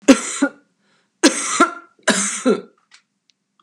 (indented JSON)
{
  "three_cough_length": "3.6 s",
  "three_cough_amplitude": 32768,
  "three_cough_signal_mean_std_ratio": 0.4,
  "survey_phase": "beta (2021-08-13 to 2022-03-07)",
  "age": "65+",
  "gender": "Female",
  "wearing_mask": "No",
  "symptom_none": true,
  "smoker_status": "Prefer not to say",
  "respiratory_condition_asthma": false,
  "respiratory_condition_other": false,
  "recruitment_source": "REACT",
  "submission_delay": "1 day",
  "covid_test_result": "Negative",
  "covid_test_method": "RT-qPCR",
  "influenza_a_test_result": "Negative",
  "influenza_b_test_result": "Negative"
}